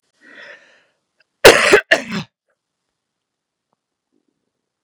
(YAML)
cough_length: 4.8 s
cough_amplitude: 32768
cough_signal_mean_std_ratio: 0.23
survey_phase: beta (2021-08-13 to 2022-03-07)
age: 45-64
gender: Female
wearing_mask: 'No'
symptom_runny_or_blocked_nose: true
symptom_headache: true
symptom_onset: 9 days
smoker_status: Never smoked
respiratory_condition_asthma: false
respiratory_condition_other: false
recruitment_source: REACT
submission_delay: 2 days
covid_test_result: Positive
covid_test_method: RT-qPCR
covid_ct_value: 26.0
covid_ct_gene: E gene
influenza_a_test_result: Negative
influenza_b_test_result: Negative